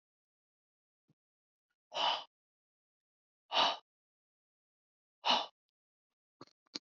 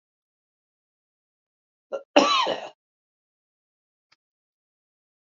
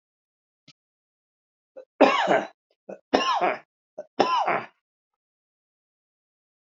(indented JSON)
{
  "exhalation_length": "7.0 s",
  "exhalation_amplitude": 5299,
  "exhalation_signal_mean_std_ratio": 0.24,
  "cough_length": "5.3 s",
  "cough_amplitude": 27684,
  "cough_signal_mean_std_ratio": 0.22,
  "three_cough_length": "6.7 s",
  "three_cough_amplitude": 27309,
  "three_cough_signal_mean_std_ratio": 0.33,
  "survey_phase": "alpha (2021-03-01 to 2021-08-12)",
  "age": "65+",
  "gender": "Male",
  "wearing_mask": "No",
  "symptom_none": true,
  "smoker_status": "Ex-smoker",
  "respiratory_condition_asthma": false,
  "respiratory_condition_other": false,
  "recruitment_source": "Test and Trace",
  "submission_delay": "0 days",
  "covid_test_result": "Negative",
  "covid_test_method": "LFT"
}